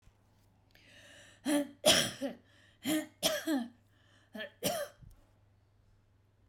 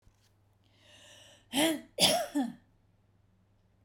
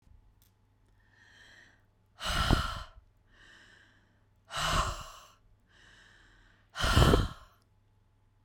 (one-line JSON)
{"three_cough_length": "6.5 s", "three_cough_amplitude": 11122, "three_cough_signal_mean_std_ratio": 0.39, "cough_length": "3.8 s", "cough_amplitude": 11320, "cough_signal_mean_std_ratio": 0.35, "exhalation_length": "8.4 s", "exhalation_amplitude": 12737, "exhalation_signal_mean_std_ratio": 0.33, "survey_phase": "beta (2021-08-13 to 2022-03-07)", "age": "45-64", "gender": "Female", "wearing_mask": "No", "symptom_none": true, "smoker_status": "Never smoked", "respiratory_condition_asthma": false, "respiratory_condition_other": false, "recruitment_source": "REACT", "submission_delay": "2 days", "covid_test_result": "Negative", "covid_test_method": "RT-qPCR"}